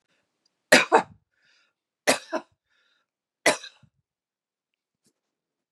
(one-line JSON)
{"three_cough_length": "5.7 s", "three_cough_amplitude": 26498, "three_cough_signal_mean_std_ratio": 0.21, "survey_phase": "beta (2021-08-13 to 2022-03-07)", "age": "45-64", "gender": "Female", "wearing_mask": "No", "symptom_cough_any": true, "symptom_runny_or_blocked_nose": true, "symptom_sore_throat": true, "symptom_headache": true, "symptom_onset": "11 days", "smoker_status": "Never smoked", "respiratory_condition_asthma": false, "respiratory_condition_other": false, "recruitment_source": "Test and Trace", "submission_delay": "2 days", "covid_test_result": "Positive", "covid_test_method": "RT-qPCR", "covid_ct_value": 20.6, "covid_ct_gene": "N gene"}